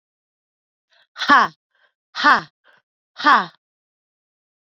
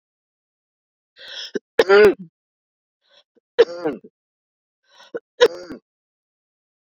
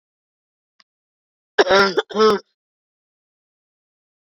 {"exhalation_length": "4.8 s", "exhalation_amplitude": 30430, "exhalation_signal_mean_std_ratio": 0.27, "three_cough_length": "6.8 s", "three_cough_amplitude": 30608, "three_cough_signal_mean_std_ratio": 0.25, "cough_length": "4.4 s", "cough_amplitude": 27987, "cough_signal_mean_std_ratio": 0.29, "survey_phase": "beta (2021-08-13 to 2022-03-07)", "age": "45-64", "gender": "Female", "wearing_mask": "No", "symptom_cough_any": true, "symptom_new_continuous_cough": true, "symptom_runny_or_blocked_nose": true, "symptom_shortness_of_breath": true, "symptom_fever_high_temperature": true, "symptom_change_to_sense_of_smell_or_taste": true, "symptom_loss_of_taste": true, "symptom_onset": "3 days", "smoker_status": "Never smoked", "respiratory_condition_asthma": false, "respiratory_condition_other": false, "recruitment_source": "Test and Trace", "submission_delay": "2 days", "covid_test_result": "Positive", "covid_test_method": "RT-qPCR", "covid_ct_value": 26.1, "covid_ct_gene": "ORF1ab gene", "covid_ct_mean": 26.6, "covid_viral_load": "1900 copies/ml", "covid_viral_load_category": "Minimal viral load (< 10K copies/ml)"}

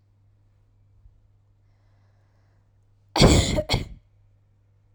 {"cough_length": "4.9 s", "cough_amplitude": 27499, "cough_signal_mean_std_ratio": 0.27, "survey_phase": "alpha (2021-03-01 to 2021-08-12)", "age": "18-44", "gender": "Female", "wearing_mask": "No", "symptom_none": true, "smoker_status": "Never smoked", "respiratory_condition_asthma": false, "respiratory_condition_other": false, "recruitment_source": "REACT", "submission_delay": "1 day", "covid_test_result": "Negative", "covid_test_method": "RT-qPCR"}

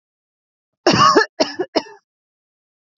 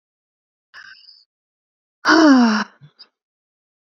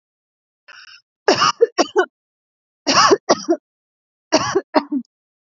{"cough_length": "3.0 s", "cough_amplitude": 28120, "cough_signal_mean_std_ratio": 0.35, "exhalation_length": "3.8 s", "exhalation_amplitude": 30135, "exhalation_signal_mean_std_ratio": 0.33, "three_cough_length": "5.5 s", "three_cough_amplitude": 30220, "three_cough_signal_mean_std_ratio": 0.38, "survey_phase": "beta (2021-08-13 to 2022-03-07)", "age": "18-44", "gender": "Female", "wearing_mask": "Yes", "symptom_runny_or_blocked_nose": true, "symptom_sore_throat": true, "symptom_fatigue": true, "smoker_status": "Never smoked", "respiratory_condition_asthma": false, "respiratory_condition_other": false, "recruitment_source": "REACT", "submission_delay": "4 days", "covid_test_result": "Negative", "covid_test_method": "RT-qPCR", "influenza_a_test_result": "Unknown/Void", "influenza_b_test_result": "Unknown/Void"}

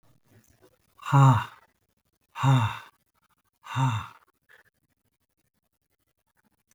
{"exhalation_length": "6.7 s", "exhalation_amplitude": 15798, "exhalation_signal_mean_std_ratio": 0.3, "survey_phase": "beta (2021-08-13 to 2022-03-07)", "age": "65+", "gender": "Male", "wearing_mask": "No", "symptom_none": true, "smoker_status": "Never smoked", "respiratory_condition_asthma": false, "respiratory_condition_other": false, "recruitment_source": "REACT", "submission_delay": "10 days", "covid_test_result": "Negative", "covid_test_method": "RT-qPCR"}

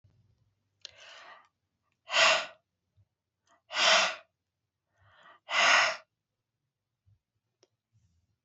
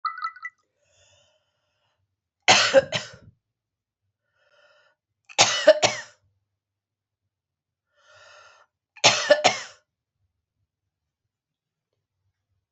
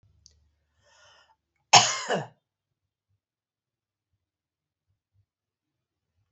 {"exhalation_length": "8.4 s", "exhalation_amplitude": 11555, "exhalation_signal_mean_std_ratio": 0.3, "three_cough_length": "12.7 s", "three_cough_amplitude": 29075, "three_cough_signal_mean_std_ratio": 0.24, "cough_length": "6.3 s", "cough_amplitude": 30921, "cough_signal_mean_std_ratio": 0.16, "survey_phase": "beta (2021-08-13 to 2022-03-07)", "age": "65+", "gender": "Female", "wearing_mask": "No", "symptom_cough_any": true, "symptom_runny_or_blocked_nose": true, "symptom_fatigue": true, "symptom_other": true, "symptom_onset": "5 days", "smoker_status": "Never smoked", "respiratory_condition_asthma": false, "respiratory_condition_other": false, "recruitment_source": "Test and Trace", "submission_delay": "2 days", "covid_test_result": "Positive", "covid_test_method": "RT-qPCR"}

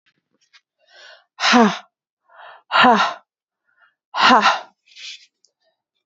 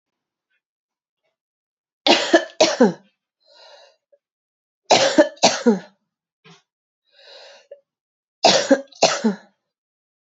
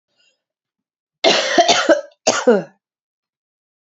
{"exhalation_length": "6.1 s", "exhalation_amplitude": 31252, "exhalation_signal_mean_std_ratio": 0.35, "three_cough_length": "10.2 s", "three_cough_amplitude": 31736, "three_cough_signal_mean_std_ratio": 0.32, "cough_length": "3.8 s", "cough_amplitude": 32767, "cough_signal_mean_std_ratio": 0.4, "survey_phase": "alpha (2021-03-01 to 2021-08-12)", "age": "18-44", "gender": "Female", "wearing_mask": "No", "symptom_cough_any": true, "symptom_new_continuous_cough": true, "symptom_shortness_of_breath": true, "symptom_fatigue": true, "symptom_headache": true, "symptom_change_to_sense_of_smell_or_taste": true, "smoker_status": "Ex-smoker", "respiratory_condition_asthma": false, "respiratory_condition_other": false, "recruitment_source": "Test and Trace", "submission_delay": "2 days", "covid_test_result": "Positive", "covid_test_method": "RT-qPCR", "covid_ct_value": 31.9, "covid_ct_gene": "ORF1ab gene"}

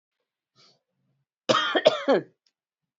{"cough_length": "3.0 s", "cough_amplitude": 26057, "cough_signal_mean_std_ratio": 0.32, "survey_phase": "beta (2021-08-13 to 2022-03-07)", "age": "18-44", "gender": "Female", "wearing_mask": "Yes", "symptom_runny_or_blocked_nose": true, "symptom_change_to_sense_of_smell_or_taste": true, "symptom_onset": "6 days", "smoker_status": "Never smoked", "respiratory_condition_asthma": false, "respiratory_condition_other": false, "recruitment_source": "Test and Trace", "submission_delay": "2 days", "covid_test_result": "Positive", "covid_test_method": "RT-qPCR", "covid_ct_value": 26.0, "covid_ct_gene": "ORF1ab gene", "covid_ct_mean": 26.4, "covid_viral_load": "2200 copies/ml", "covid_viral_load_category": "Minimal viral load (< 10K copies/ml)"}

